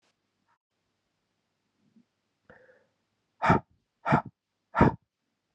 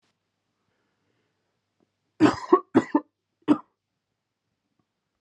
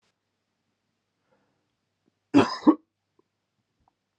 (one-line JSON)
{"exhalation_length": "5.5 s", "exhalation_amplitude": 17927, "exhalation_signal_mean_std_ratio": 0.22, "three_cough_length": "5.2 s", "three_cough_amplitude": 22641, "three_cough_signal_mean_std_ratio": 0.21, "cough_length": "4.2 s", "cough_amplitude": 17409, "cough_signal_mean_std_ratio": 0.18, "survey_phase": "alpha (2021-03-01 to 2021-08-12)", "age": "18-44", "gender": "Male", "wearing_mask": "No", "symptom_cough_any": true, "symptom_headache": true, "symptom_change_to_sense_of_smell_or_taste": true, "symptom_loss_of_taste": true, "symptom_onset": "2 days", "smoker_status": "Ex-smoker", "respiratory_condition_asthma": false, "respiratory_condition_other": false, "recruitment_source": "Test and Trace", "submission_delay": "2 days", "covid_test_result": "Positive", "covid_test_method": "RT-qPCR", "covid_ct_value": 11.5, "covid_ct_gene": "ORF1ab gene", "covid_ct_mean": 12.1, "covid_viral_load": "110000000 copies/ml", "covid_viral_load_category": "High viral load (>1M copies/ml)"}